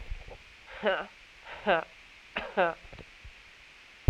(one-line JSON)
{"exhalation_length": "4.1 s", "exhalation_amplitude": 11165, "exhalation_signal_mean_std_ratio": 0.36, "survey_phase": "alpha (2021-03-01 to 2021-08-12)", "age": "18-44", "gender": "Female", "wearing_mask": "No", "symptom_cough_any": true, "symptom_new_continuous_cough": true, "symptom_shortness_of_breath": true, "symptom_fatigue": true, "symptom_fever_high_temperature": true, "symptom_headache": true, "symptom_onset": "3 days", "smoker_status": "Ex-smoker", "respiratory_condition_asthma": false, "respiratory_condition_other": false, "recruitment_source": "Test and Trace", "submission_delay": "2 days", "covid_test_result": "Positive", "covid_test_method": "RT-qPCR", "covid_ct_value": 17.7, "covid_ct_gene": "ORF1ab gene", "covid_ct_mean": 18.1, "covid_viral_load": "1200000 copies/ml", "covid_viral_load_category": "High viral load (>1M copies/ml)"}